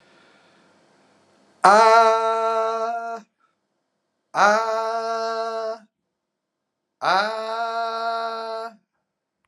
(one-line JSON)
{"exhalation_length": "9.5 s", "exhalation_amplitude": 31202, "exhalation_signal_mean_std_ratio": 0.49, "survey_phase": "alpha (2021-03-01 to 2021-08-12)", "age": "45-64", "gender": "Male", "wearing_mask": "No", "symptom_abdominal_pain": true, "symptom_diarrhoea": true, "symptom_fever_high_temperature": true, "symptom_headache": true, "symptom_onset": "2 days", "smoker_status": "Current smoker (1 to 10 cigarettes per day)", "respiratory_condition_asthma": false, "respiratory_condition_other": false, "recruitment_source": "Test and Trace", "submission_delay": "1 day", "covid_test_result": "Positive", "covid_test_method": "LFT"}